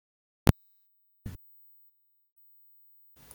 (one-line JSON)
{"cough_length": "3.3 s", "cough_amplitude": 22157, "cough_signal_mean_std_ratio": 0.11, "survey_phase": "beta (2021-08-13 to 2022-03-07)", "age": "18-44", "gender": "Male", "wearing_mask": "No", "symptom_none": true, "smoker_status": "Never smoked", "respiratory_condition_asthma": false, "respiratory_condition_other": false, "recruitment_source": "REACT", "submission_delay": "2 days", "covid_test_result": "Negative", "covid_test_method": "RT-qPCR"}